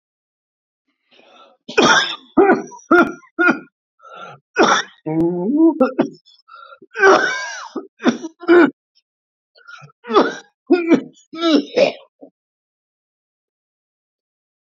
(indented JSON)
{
  "cough_length": "14.7 s",
  "cough_amplitude": 32768,
  "cough_signal_mean_std_ratio": 0.42,
  "survey_phase": "beta (2021-08-13 to 2022-03-07)",
  "age": "65+",
  "gender": "Male",
  "wearing_mask": "No",
  "symptom_cough_any": true,
  "symptom_sore_throat": true,
  "symptom_fatigue": true,
  "symptom_onset": "7 days",
  "smoker_status": "Never smoked",
  "respiratory_condition_asthma": true,
  "respiratory_condition_other": false,
  "recruitment_source": "Test and Trace",
  "submission_delay": "2 days",
  "covid_test_result": "Positive",
  "covid_test_method": "RT-qPCR",
  "covid_ct_value": 21.0,
  "covid_ct_gene": "ORF1ab gene",
  "covid_ct_mean": 21.3,
  "covid_viral_load": "100000 copies/ml",
  "covid_viral_load_category": "Low viral load (10K-1M copies/ml)"
}